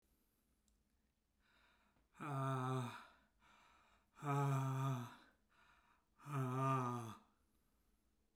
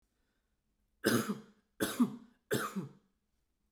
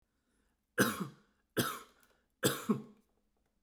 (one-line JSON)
{"exhalation_length": "8.4 s", "exhalation_amplitude": 1364, "exhalation_signal_mean_std_ratio": 0.49, "cough_length": "3.7 s", "cough_amplitude": 5581, "cough_signal_mean_std_ratio": 0.37, "three_cough_length": "3.6 s", "three_cough_amplitude": 7155, "three_cough_signal_mean_std_ratio": 0.34, "survey_phase": "beta (2021-08-13 to 2022-03-07)", "age": "45-64", "gender": "Male", "wearing_mask": "No", "symptom_none": true, "smoker_status": "Never smoked", "respiratory_condition_asthma": false, "respiratory_condition_other": false, "recruitment_source": "REACT", "submission_delay": "1 day", "covid_test_result": "Negative", "covid_test_method": "RT-qPCR"}